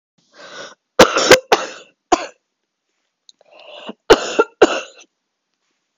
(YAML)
cough_length: 6.0 s
cough_amplitude: 32768
cough_signal_mean_std_ratio: 0.29
survey_phase: beta (2021-08-13 to 2022-03-07)
age: 18-44
gender: Female
wearing_mask: 'No'
symptom_cough_any: true
symptom_headache: true
smoker_status: Ex-smoker
respiratory_condition_asthma: false
respiratory_condition_other: false
recruitment_source: REACT
submission_delay: 3 days
covid_test_result: Negative
covid_test_method: RT-qPCR
influenza_a_test_result: Negative
influenza_b_test_result: Negative